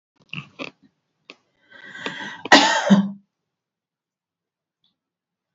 {"cough_length": "5.5 s", "cough_amplitude": 29506, "cough_signal_mean_std_ratio": 0.27, "survey_phase": "beta (2021-08-13 to 2022-03-07)", "age": "45-64", "gender": "Female", "wearing_mask": "No", "symptom_none": true, "smoker_status": "Ex-smoker", "respiratory_condition_asthma": false, "respiratory_condition_other": false, "recruitment_source": "REACT", "submission_delay": "1 day", "covid_test_result": "Negative", "covid_test_method": "RT-qPCR"}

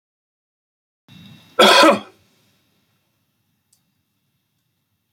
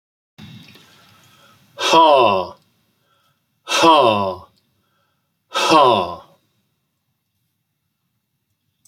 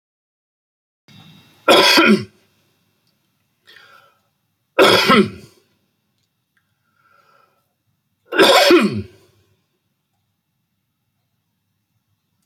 {"cough_length": "5.1 s", "cough_amplitude": 30763, "cough_signal_mean_std_ratio": 0.23, "exhalation_length": "8.9 s", "exhalation_amplitude": 30891, "exhalation_signal_mean_std_ratio": 0.36, "three_cough_length": "12.5 s", "three_cough_amplitude": 32767, "three_cough_signal_mean_std_ratio": 0.3, "survey_phase": "beta (2021-08-13 to 2022-03-07)", "age": "65+", "gender": "Male", "wearing_mask": "No", "symptom_cough_any": true, "symptom_runny_or_blocked_nose": true, "smoker_status": "Never smoked", "respiratory_condition_asthma": false, "respiratory_condition_other": false, "recruitment_source": "REACT", "submission_delay": "2 days", "covid_test_result": "Negative", "covid_test_method": "RT-qPCR", "influenza_a_test_result": "Negative", "influenza_b_test_result": "Negative"}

